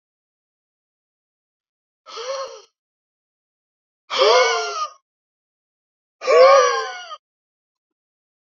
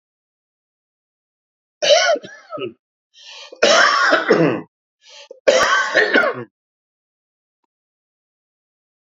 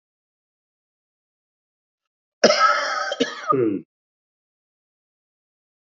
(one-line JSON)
{"exhalation_length": "8.4 s", "exhalation_amplitude": 27390, "exhalation_signal_mean_std_ratio": 0.32, "three_cough_length": "9.0 s", "three_cough_amplitude": 31948, "three_cough_signal_mean_std_ratio": 0.42, "cough_length": "6.0 s", "cough_amplitude": 27654, "cough_signal_mean_std_ratio": 0.33, "survey_phase": "beta (2021-08-13 to 2022-03-07)", "age": "65+", "gender": "Male", "wearing_mask": "No", "symptom_cough_any": true, "symptom_runny_or_blocked_nose": true, "symptom_onset": "3 days", "smoker_status": "Ex-smoker", "respiratory_condition_asthma": false, "respiratory_condition_other": false, "recruitment_source": "Test and Trace", "submission_delay": "2 days", "covid_test_result": "Positive", "covid_test_method": "RT-qPCR", "covid_ct_value": 21.5, "covid_ct_gene": "ORF1ab gene", "covid_ct_mean": 22.1, "covid_viral_load": "58000 copies/ml", "covid_viral_load_category": "Low viral load (10K-1M copies/ml)"}